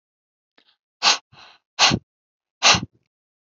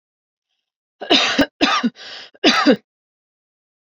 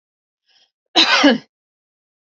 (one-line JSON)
{"exhalation_length": "3.5 s", "exhalation_amplitude": 29145, "exhalation_signal_mean_std_ratio": 0.29, "three_cough_length": "3.8 s", "three_cough_amplitude": 28905, "three_cough_signal_mean_std_ratio": 0.4, "cough_length": "2.3 s", "cough_amplitude": 31722, "cough_signal_mean_std_ratio": 0.34, "survey_phase": "alpha (2021-03-01 to 2021-08-12)", "age": "45-64", "gender": "Female", "wearing_mask": "No", "symptom_none": true, "smoker_status": "Never smoked", "respiratory_condition_asthma": false, "respiratory_condition_other": false, "recruitment_source": "Test and Trace", "submission_delay": "1 day", "covid_test_result": "Negative", "covid_test_method": "RT-qPCR"}